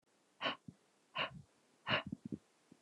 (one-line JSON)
{"exhalation_length": "2.8 s", "exhalation_amplitude": 2890, "exhalation_signal_mean_std_ratio": 0.37, "survey_phase": "beta (2021-08-13 to 2022-03-07)", "age": "45-64", "gender": "Female", "wearing_mask": "No", "symptom_cough_any": true, "symptom_runny_or_blocked_nose": true, "smoker_status": "Never smoked", "respiratory_condition_asthma": false, "respiratory_condition_other": false, "recruitment_source": "Test and Trace", "submission_delay": "2 days", "covid_test_result": "Positive", "covid_test_method": "RT-qPCR", "covid_ct_value": 14.6, "covid_ct_gene": "ORF1ab gene", "covid_ct_mean": 15.0, "covid_viral_load": "12000000 copies/ml", "covid_viral_load_category": "High viral load (>1M copies/ml)"}